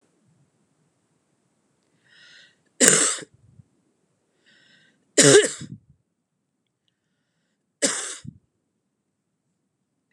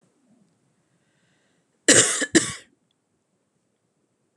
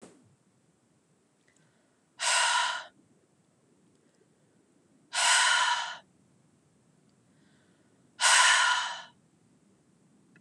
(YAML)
three_cough_length: 10.1 s
three_cough_amplitude: 32768
three_cough_signal_mean_std_ratio: 0.22
cough_length: 4.4 s
cough_amplitude: 30578
cough_signal_mean_std_ratio: 0.24
exhalation_length: 10.4 s
exhalation_amplitude: 13042
exhalation_signal_mean_std_ratio: 0.37
survey_phase: beta (2021-08-13 to 2022-03-07)
age: 18-44
gender: Female
wearing_mask: 'No'
symptom_cough_any: true
symptom_runny_or_blocked_nose: true
symptom_fatigue: true
symptom_headache: true
symptom_onset: 3 days
smoker_status: Never smoked
respiratory_condition_asthma: false
respiratory_condition_other: false
recruitment_source: Test and Trace
submission_delay: 2 days
covid_test_result: Positive
covid_test_method: RT-qPCR
covid_ct_value: 12.9
covid_ct_gene: ORF1ab gene
covid_ct_mean: 13.4
covid_viral_load: 39000000 copies/ml
covid_viral_load_category: High viral load (>1M copies/ml)